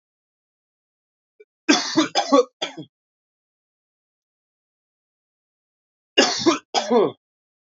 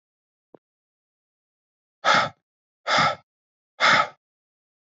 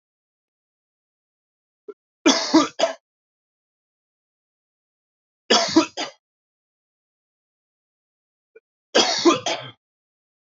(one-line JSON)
{"cough_length": "7.8 s", "cough_amplitude": 29045, "cough_signal_mean_std_ratio": 0.31, "exhalation_length": "4.9 s", "exhalation_amplitude": 18505, "exhalation_signal_mean_std_ratio": 0.31, "three_cough_length": "10.5 s", "three_cough_amplitude": 24791, "three_cough_signal_mean_std_ratio": 0.27, "survey_phase": "beta (2021-08-13 to 2022-03-07)", "age": "18-44", "gender": "Male", "wearing_mask": "No", "symptom_cough_any": true, "symptom_runny_or_blocked_nose": true, "symptom_sore_throat": true, "symptom_diarrhoea": true, "symptom_fatigue": true, "symptom_headache": true, "symptom_change_to_sense_of_smell_or_taste": true, "smoker_status": "Never smoked", "respiratory_condition_asthma": false, "respiratory_condition_other": false, "recruitment_source": "Test and Trace", "submission_delay": "2 days", "covid_test_result": "Positive", "covid_test_method": "RT-qPCR", "covid_ct_value": 23.0, "covid_ct_gene": "ORF1ab gene"}